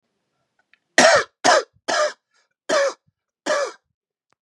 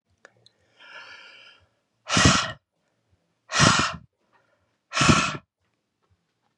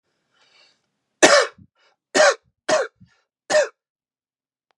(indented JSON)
{
  "cough_length": "4.4 s",
  "cough_amplitude": 32751,
  "cough_signal_mean_std_ratio": 0.39,
  "exhalation_length": "6.6 s",
  "exhalation_amplitude": 28753,
  "exhalation_signal_mean_std_ratio": 0.34,
  "three_cough_length": "4.8 s",
  "three_cough_amplitude": 32768,
  "three_cough_signal_mean_std_ratio": 0.31,
  "survey_phase": "beta (2021-08-13 to 2022-03-07)",
  "age": "18-44",
  "gender": "Male",
  "wearing_mask": "No",
  "symptom_none": true,
  "smoker_status": "Never smoked",
  "respiratory_condition_asthma": false,
  "respiratory_condition_other": false,
  "recruitment_source": "REACT",
  "submission_delay": "3 days",
  "covid_test_result": "Negative",
  "covid_test_method": "RT-qPCR",
  "influenza_a_test_result": "Negative",
  "influenza_b_test_result": "Negative"
}